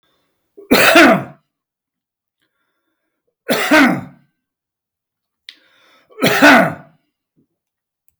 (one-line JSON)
{"three_cough_length": "8.2 s", "three_cough_amplitude": 32768, "three_cough_signal_mean_std_ratio": 0.35, "survey_phase": "beta (2021-08-13 to 2022-03-07)", "age": "65+", "gender": "Male", "wearing_mask": "No", "symptom_none": true, "smoker_status": "Never smoked", "respiratory_condition_asthma": false, "respiratory_condition_other": false, "recruitment_source": "REACT", "submission_delay": "5 days", "covid_test_result": "Negative", "covid_test_method": "RT-qPCR", "influenza_a_test_result": "Negative", "influenza_b_test_result": "Negative"}